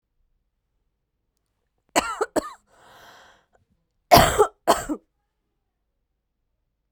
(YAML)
cough_length: 6.9 s
cough_amplitude: 32767
cough_signal_mean_std_ratio: 0.24
survey_phase: beta (2021-08-13 to 2022-03-07)
age: 18-44
gender: Female
wearing_mask: 'No'
symptom_cough_any: true
symptom_runny_or_blocked_nose: true
symptom_headache: true
symptom_change_to_sense_of_smell_or_taste: true
symptom_loss_of_taste: true
symptom_onset: 4 days
smoker_status: Never smoked
respiratory_condition_asthma: false
respiratory_condition_other: false
recruitment_source: Test and Trace
submission_delay: 1 day
covid_test_result: Positive
covid_test_method: RT-qPCR